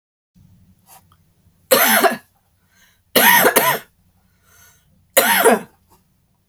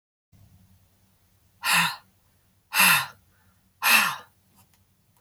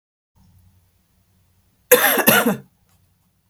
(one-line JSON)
{"three_cough_length": "6.5 s", "three_cough_amplitude": 32768, "three_cough_signal_mean_std_ratio": 0.39, "exhalation_length": "5.2 s", "exhalation_amplitude": 21657, "exhalation_signal_mean_std_ratio": 0.34, "cough_length": "3.5 s", "cough_amplitude": 32768, "cough_signal_mean_std_ratio": 0.32, "survey_phase": "beta (2021-08-13 to 2022-03-07)", "age": "45-64", "gender": "Female", "wearing_mask": "No", "symptom_none": true, "smoker_status": "Never smoked", "respiratory_condition_asthma": false, "respiratory_condition_other": false, "recruitment_source": "REACT", "submission_delay": "3 days", "covid_test_result": "Negative", "covid_test_method": "RT-qPCR"}